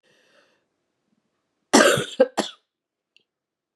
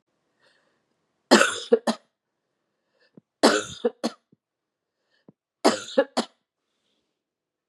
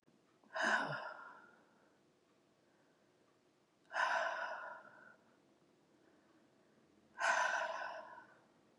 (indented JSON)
{
  "cough_length": "3.8 s",
  "cough_amplitude": 32611,
  "cough_signal_mean_std_ratio": 0.26,
  "three_cough_length": "7.7 s",
  "three_cough_amplitude": 27828,
  "three_cough_signal_mean_std_ratio": 0.26,
  "exhalation_length": "8.8 s",
  "exhalation_amplitude": 2769,
  "exhalation_signal_mean_std_ratio": 0.42,
  "survey_phase": "beta (2021-08-13 to 2022-03-07)",
  "age": "45-64",
  "gender": "Female",
  "wearing_mask": "No",
  "symptom_runny_or_blocked_nose": true,
  "symptom_headache": true,
  "symptom_change_to_sense_of_smell_or_taste": true,
  "symptom_loss_of_taste": true,
  "symptom_onset": "3 days",
  "smoker_status": "Never smoked",
  "respiratory_condition_asthma": false,
  "respiratory_condition_other": false,
  "recruitment_source": "Test and Trace",
  "submission_delay": "1 day",
  "covid_test_result": "Positive",
  "covid_test_method": "RT-qPCR",
  "covid_ct_value": 25.4,
  "covid_ct_gene": "ORF1ab gene"
}